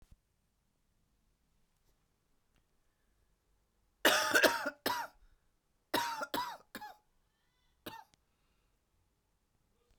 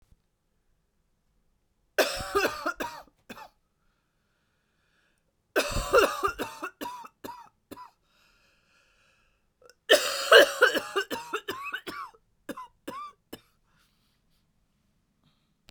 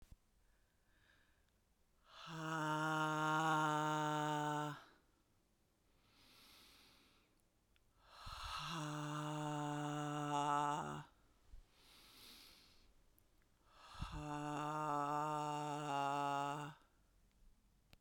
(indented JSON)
{
  "cough_length": "10.0 s",
  "cough_amplitude": 10145,
  "cough_signal_mean_std_ratio": 0.27,
  "three_cough_length": "15.7 s",
  "three_cough_amplitude": 26309,
  "three_cough_signal_mean_std_ratio": 0.29,
  "exhalation_length": "18.0 s",
  "exhalation_amplitude": 1513,
  "exhalation_signal_mean_std_ratio": 0.59,
  "survey_phase": "beta (2021-08-13 to 2022-03-07)",
  "age": "45-64",
  "gender": "Female",
  "wearing_mask": "No",
  "symptom_cough_any": true,
  "symptom_new_continuous_cough": true,
  "symptom_runny_or_blocked_nose": true,
  "symptom_fatigue": true,
  "symptom_fever_high_temperature": true,
  "symptom_other": true,
  "symptom_onset": "5 days",
  "smoker_status": "Never smoked",
  "respiratory_condition_asthma": false,
  "respiratory_condition_other": false,
  "recruitment_source": "Test and Trace",
  "submission_delay": "1 day",
  "covid_test_result": "Positive",
  "covid_test_method": "RT-qPCR",
  "covid_ct_value": 22.5,
  "covid_ct_gene": "ORF1ab gene",
  "covid_ct_mean": 22.7,
  "covid_viral_load": "36000 copies/ml",
  "covid_viral_load_category": "Low viral load (10K-1M copies/ml)"
}